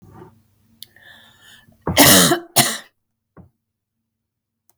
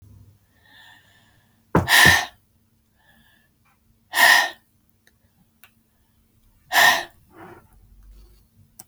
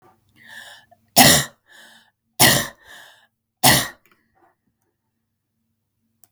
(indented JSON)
{
  "cough_length": "4.8 s",
  "cough_amplitude": 32768,
  "cough_signal_mean_std_ratio": 0.3,
  "exhalation_length": "8.9 s",
  "exhalation_amplitude": 32189,
  "exhalation_signal_mean_std_ratio": 0.29,
  "three_cough_length": "6.3 s",
  "three_cough_amplitude": 32768,
  "three_cough_signal_mean_std_ratio": 0.27,
  "survey_phase": "beta (2021-08-13 to 2022-03-07)",
  "age": "45-64",
  "gender": "Female",
  "wearing_mask": "No",
  "symptom_cough_any": true,
  "smoker_status": "Never smoked",
  "respiratory_condition_asthma": false,
  "respiratory_condition_other": false,
  "recruitment_source": "REACT",
  "submission_delay": "2 days",
  "covid_test_result": "Negative",
  "covid_test_method": "RT-qPCR"
}